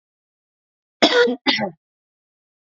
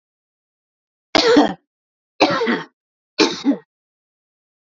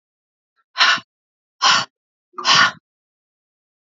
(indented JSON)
{
  "cough_length": "2.7 s",
  "cough_amplitude": 29269,
  "cough_signal_mean_std_ratio": 0.34,
  "three_cough_length": "4.6 s",
  "three_cough_amplitude": 30522,
  "three_cough_signal_mean_std_ratio": 0.37,
  "exhalation_length": "3.9 s",
  "exhalation_amplitude": 29414,
  "exhalation_signal_mean_std_ratio": 0.34,
  "survey_phase": "beta (2021-08-13 to 2022-03-07)",
  "age": "45-64",
  "gender": "Female",
  "wearing_mask": "No",
  "symptom_runny_or_blocked_nose": true,
  "smoker_status": "Current smoker (11 or more cigarettes per day)",
  "respiratory_condition_asthma": false,
  "respiratory_condition_other": false,
  "recruitment_source": "REACT",
  "submission_delay": "1 day",
  "covid_test_result": "Negative",
  "covid_test_method": "RT-qPCR",
  "influenza_a_test_result": "Negative",
  "influenza_b_test_result": "Negative"
}